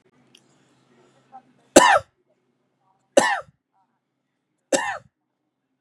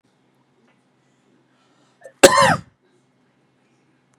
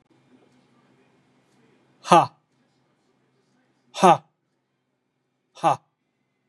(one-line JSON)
{"three_cough_length": "5.8 s", "three_cough_amplitude": 32768, "three_cough_signal_mean_std_ratio": 0.23, "cough_length": "4.2 s", "cough_amplitude": 32768, "cough_signal_mean_std_ratio": 0.21, "exhalation_length": "6.5 s", "exhalation_amplitude": 30826, "exhalation_signal_mean_std_ratio": 0.2, "survey_phase": "beta (2021-08-13 to 2022-03-07)", "age": "18-44", "gender": "Male", "wearing_mask": "No", "symptom_none": true, "smoker_status": "Never smoked", "respiratory_condition_asthma": false, "respiratory_condition_other": false, "recruitment_source": "REACT", "submission_delay": "1 day", "covid_test_result": "Negative", "covid_test_method": "RT-qPCR", "influenza_a_test_result": "Negative", "influenza_b_test_result": "Negative"}